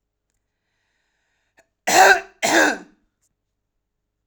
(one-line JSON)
{"cough_length": "4.3 s", "cough_amplitude": 32767, "cough_signal_mean_std_ratio": 0.3, "survey_phase": "alpha (2021-03-01 to 2021-08-12)", "age": "45-64", "gender": "Female", "wearing_mask": "No", "symptom_none": true, "smoker_status": "Never smoked", "respiratory_condition_asthma": false, "respiratory_condition_other": false, "recruitment_source": "REACT", "submission_delay": "2 days", "covid_test_result": "Negative", "covid_test_method": "RT-qPCR"}